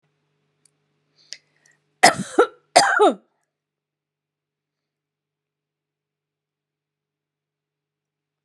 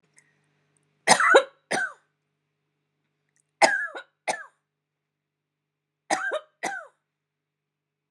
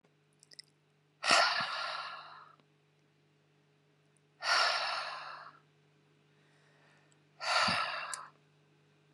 {"cough_length": "8.4 s", "cough_amplitude": 32768, "cough_signal_mean_std_ratio": 0.2, "three_cough_length": "8.1 s", "three_cough_amplitude": 30687, "three_cough_signal_mean_std_ratio": 0.27, "exhalation_length": "9.1 s", "exhalation_amplitude": 8899, "exhalation_signal_mean_std_ratio": 0.4, "survey_phase": "beta (2021-08-13 to 2022-03-07)", "age": "45-64", "gender": "Female", "wearing_mask": "No", "symptom_none": true, "smoker_status": "Never smoked", "respiratory_condition_asthma": false, "respiratory_condition_other": false, "recruitment_source": "REACT", "submission_delay": "2 days", "covid_test_result": "Negative", "covid_test_method": "RT-qPCR"}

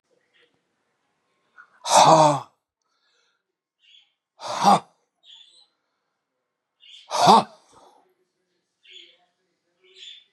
{"exhalation_length": "10.3 s", "exhalation_amplitude": 29320, "exhalation_signal_mean_std_ratio": 0.26, "survey_phase": "beta (2021-08-13 to 2022-03-07)", "age": "65+", "gender": "Male", "wearing_mask": "No", "symptom_none": true, "smoker_status": "Never smoked", "respiratory_condition_asthma": false, "respiratory_condition_other": false, "recruitment_source": "REACT", "submission_delay": "1 day", "covid_test_result": "Negative", "covid_test_method": "RT-qPCR"}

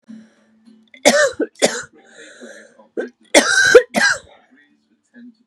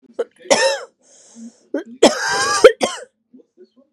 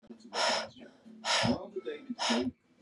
{"three_cough_length": "5.5 s", "three_cough_amplitude": 32768, "three_cough_signal_mean_std_ratio": 0.37, "cough_length": "3.9 s", "cough_amplitude": 32768, "cough_signal_mean_std_ratio": 0.38, "exhalation_length": "2.8 s", "exhalation_amplitude": 5072, "exhalation_signal_mean_std_ratio": 0.62, "survey_phase": "beta (2021-08-13 to 2022-03-07)", "age": "18-44", "gender": "Female", "wearing_mask": "No", "symptom_cough_any": true, "symptom_runny_or_blocked_nose": true, "symptom_sore_throat": true, "symptom_fatigue": true, "symptom_fever_high_temperature": true, "symptom_headache": true, "symptom_onset": "3 days", "smoker_status": "Current smoker (e-cigarettes or vapes only)", "respiratory_condition_asthma": false, "respiratory_condition_other": false, "recruitment_source": "Test and Trace", "submission_delay": "1 day", "covid_test_result": "Positive", "covid_test_method": "RT-qPCR", "covid_ct_value": 26.6, "covid_ct_gene": "ORF1ab gene"}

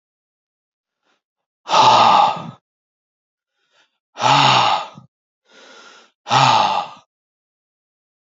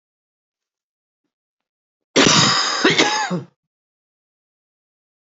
{"exhalation_length": "8.4 s", "exhalation_amplitude": 28578, "exhalation_signal_mean_std_ratio": 0.4, "cough_length": "5.4 s", "cough_amplitude": 30476, "cough_signal_mean_std_ratio": 0.37, "survey_phase": "alpha (2021-03-01 to 2021-08-12)", "age": "45-64", "gender": "Male", "wearing_mask": "No", "symptom_cough_any": true, "symptom_new_continuous_cough": true, "symptom_shortness_of_breath": true, "symptom_fatigue": true, "symptom_headache": true, "symptom_onset": "4 days", "smoker_status": "Never smoked", "respiratory_condition_asthma": false, "respiratory_condition_other": false, "recruitment_source": "Test and Trace", "submission_delay": "2 days", "covid_test_result": "Positive", "covid_test_method": "RT-qPCR", "covid_ct_value": 19.7, "covid_ct_gene": "ORF1ab gene", "covid_ct_mean": 19.8, "covid_viral_load": "310000 copies/ml", "covid_viral_load_category": "Low viral load (10K-1M copies/ml)"}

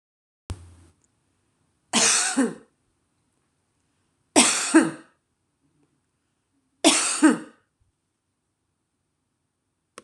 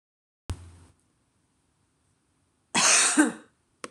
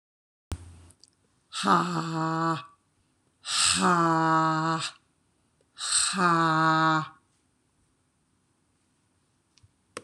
{"three_cough_length": "10.0 s", "three_cough_amplitude": 25400, "three_cough_signal_mean_std_ratio": 0.3, "cough_length": "3.9 s", "cough_amplitude": 15243, "cough_signal_mean_std_ratio": 0.33, "exhalation_length": "10.0 s", "exhalation_amplitude": 11837, "exhalation_signal_mean_std_ratio": 0.52, "survey_phase": "beta (2021-08-13 to 2022-03-07)", "age": "45-64", "gender": "Female", "wearing_mask": "No", "symptom_none": true, "smoker_status": "Never smoked", "respiratory_condition_asthma": false, "respiratory_condition_other": false, "recruitment_source": "Test and Trace", "submission_delay": "2 days", "covid_test_result": "Negative", "covid_test_method": "LFT"}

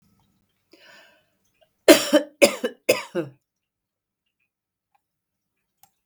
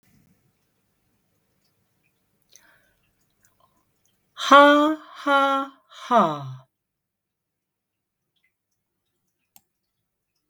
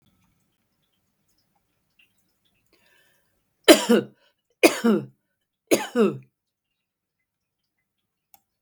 {"cough_length": "6.1 s", "cough_amplitude": 32768, "cough_signal_mean_std_ratio": 0.21, "exhalation_length": "10.5 s", "exhalation_amplitude": 32766, "exhalation_signal_mean_std_ratio": 0.24, "three_cough_length": "8.6 s", "three_cough_amplitude": 32768, "three_cough_signal_mean_std_ratio": 0.22, "survey_phase": "beta (2021-08-13 to 2022-03-07)", "age": "65+", "gender": "Female", "wearing_mask": "No", "symptom_cough_any": true, "symptom_loss_of_taste": true, "symptom_onset": "5 days", "smoker_status": "Never smoked", "respiratory_condition_asthma": false, "respiratory_condition_other": false, "recruitment_source": "Test and Trace", "submission_delay": "2 days", "covid_test_result": "Positive", "covid_test_method": "RT-qPCR", "covid_ct_value": 21.8, "covid_ct_gene": "ORF1ab gene"}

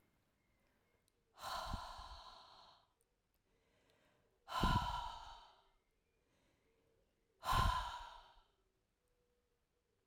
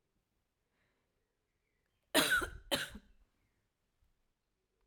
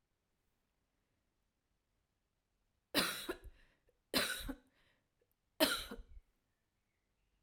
{"exhalation_length": "10.1 s", "exhalation_amplitude": 2198, "exhalation_signal_mean_std_ratio": 0.34, "cough_length": "4.9 s", "cough_amplitude": 5868, "cough_signal_mean_std_ratio": 0.25, "three_cough_length": "7.4 s", "three_cough_amplitude": 6494, "three_cough_signal_mean_std_ratio": 0.27, "survey_phase": "alpha (2021-03-01 to 2021-08-12)", "age": "65+", "gender": "Female", "wearing_mask": "No", "symptom_none": true, "smoker_status": "Never smoked", "respiratory_condition_asthma": false, "respiratory_condition_other": false, "recruitment_source": "REACT", "submission_delay": "4 days", "covid_test_result": "Negative", "covid_test_method": "RT-qPCR"}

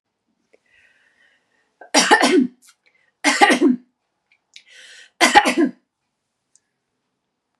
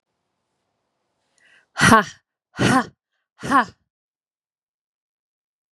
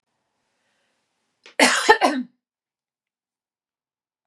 {"three_cough_length": "7.6 s", "three_cough_amplitude": 32768, "three_cough_signal_mean_std_ratio": 0.34, "exhalation_length": "5.7 s", "exhalation_amplitude": 32767, "exhalation_signal_mean_std_ratio": 0.26, "cough_length": "4.3 s", "cough_amplitude": 32767, "cough_signal_mean_std_ratio": 0.26, "survey_phase": "beta (2021-08-13 to 2022-03-07)", "age": "18-44", "gender": "Female", "wearing_mask": "No", "symptom_abdominal_pain": true, "symptom_diarrhoea": true, "symptom_fatigue": true, "symptom_onset": "13 days", "smoker_status": "Ex-smoker", "respiratory_condition_asthma": false, "respiratory_condition_other": false, "recruitment_source": "REACT", "submission_delay": "1 day", "covid_test_result": "Negative", "covid_test_method": "RT-qPCR", "influenza_a_test_result": "Negative", "influenza_b_test_result": "Negative"}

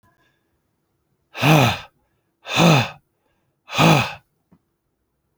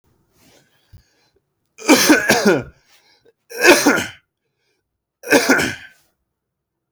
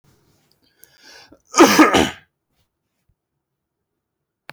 {"exhalation_length": "5.4 s", "exhalation_amplitude": 32767, "exhalation_signal_mean_std_ratio": 0.36, "three_cough_length": "6.9 s", "three_cough_amplitude": 32768, "three_cough_signal_mean_std_ratio": 0.38, "cough_length": "4.5 s", "cough_amplitude": 29119, "cough_signal_mean_std_ratio": 0.26, "survey_phase": "alpha (2021-03-01 to 2021-08-12)", "age": "18-44", "gender": "Male", "wearing_mask": "No", "symptom_new_continuous_cough": true, "symptom_fatigue": true, "symptom_fever_high_temperature": true, "symptom_headache": true, "symptom_onset": "3 days", "smoker_status": "Ex-smoker", "respiratory_condition_asthma": false, "respiratory_condition_other": false, "recruitment_source": "Test and Trace", "submission_delay": "2 days", "covid_test_result": "Positive", "covid_test_method": "RT-qPCR", "covid_ct_value": 32.1, "covid_ct_gene": "N gene"}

